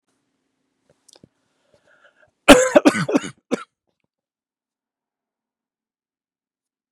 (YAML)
cough_length: 6.9 s
cough_amplitude: 32768
cough_signal_mean_std_ratio: 0.2
survey_phase: beta (2021-08-13 to 2022-03-07)
age: 45-64
gender: Male
wearing_mask: 'No'
symptom_none: true
smoker_status: Never smoked
respiratory_condition_asthma: false
respiratory_condition_other: false
recruitment_source: REACT
submission_delay: 2 days
covid_test_result: Negative
covid_test_method: RT-qPCR
influenza_a_test_result: Negative
influenza_b_test_result: Negative